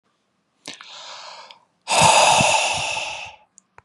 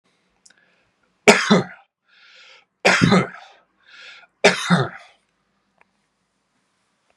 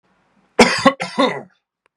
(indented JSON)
{
  "exhalation_length": "3.8 s",
  "exhalation_amplitude": 27490,
  "exhalation_signal_mean_std_ratio": 0.48,
  "three_cough_length": "7.2 s",
  "three_cough_amplitude": 32768,
  "three_cough_signal_mean_std_ratio": 0.3,
  "cough_length": "2.0 s",
  "cough_amplitude": 32768,
  "cough_signal_mean_std_ratio": 0.38,
  "survey_phase": "beta (2021-08-13 to 2022-03-07)",
  "age": "18-44",
  "gender": "Male",
  "wearing_mask": "No",
  "symptom_none": true,
  "smoker_status": "Never smoked",
  "respiratory_condition_asthma": false,
  "respiratory_condition_other": false,
  "recruitment_source": "REACT",
  "submission_delay": "2 days",
  "covid_test_result": "Negative",
  "covid_test_method": "RT-qPCR"
}